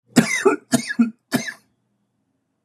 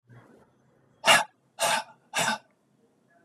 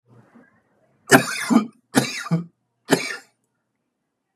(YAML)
cough_length: 2.6 s
cough_amplitude: 30505
cough_signal_mean_std_ratio: 0.39
exhalation_length: 3.2 s
exhalation_amplitude: 17789
exhalation_signal_mean_std_ratio: 0.34
three_cough_length: 4.4 s
three_cough_amplitude: 32768
three_cough_signal_mean_std_ratio: 0.33
survey_phase: beta (2021-08-13 to 2022-03-07)
age: 45-64
gender: Male
wearing_mask: 'No'
symptom_cough_any: true
symptom_shortness_of_breath: true
symptom_fatigue: true
symptom_onset: 12 days
smoker_status: Ex-smoker
respiratory_condition_asthma: false
respiratory_condition_other: false
recruitment_source: REACT
submission_delay: 1 day
covid_test_result: Negative
covid_test_method: RT-qPCR
influenza_a_test_result: Negative
influenza_b_test_result: Negative